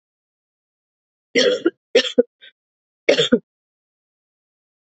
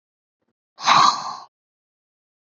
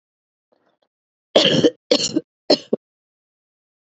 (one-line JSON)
{"three_cough_length": "4.9 s", "three_cough_amplitude": 31637, "three_cough_signal_mean_std_ratio": 0.28, "exhalation_length": "2.6 s", "exhalation_amplitude": 28449, "exhalation_signal_mean_std_ratio": 0.31, "cough_length": "3.9 s", "cough_amplitude": 32767, "cough_signal_mean_std_ratio": 0.31, "survey_phase": "beta (2021-08-13 to 2022-03-07)", "age": "18-44", "gender": "Female", "wearing_mask": "No", "symptom_cough_any": true, "symptom_runny_or_blocked_nose": true, "symptom_shortness_of_breath": true, "symptom_sore_throat": true, "symptom_onset": "3 days", "smoker_status": "Never smoked", "respiratory_condition_asthma": false, "respiratory_condition_other": false, "recruitment_source": "Test and Trace", "submission_delay": "1 day", "covid_test_result": "Positive", "covid_test_method": "ePCR"}